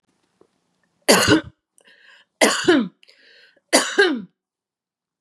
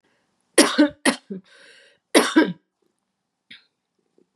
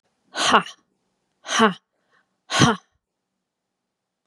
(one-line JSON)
{"three_cough_length": "5.2 s", "three_cough_amplitude": 32651, "three_cough_signal_mean_std_ratio": 0.37, "cough_length": "4.4 s", "cough_amplitude": 32051, "cough_signal_mean_std_ratio": 0.31, "exhalation_length": "4.3 s", "exhalation_amplitude": 31813, "exhalation_signal_mean_std_ratio": 0.3, "survey_phase": "beta (2021-08-13 to 2022-03-07)", "age": "45-64", "gender": "Female", "wearing_mask": "No", "symptom_sore_throat": true, "symptom_onset": "4 days", "smoker_status": "Ex-smoker", "respiratory_condition_asthma": false, "respiratory_condition_other": false, "recruitment_source": "REACT", "submission_delay": "1 day", "covid_test_result": "Negative", "covid_test_method": "RT-qPCR", "influenza_a_test_result": "Unknown/Void", "influenza_b_test_result": "Unknown/Void"}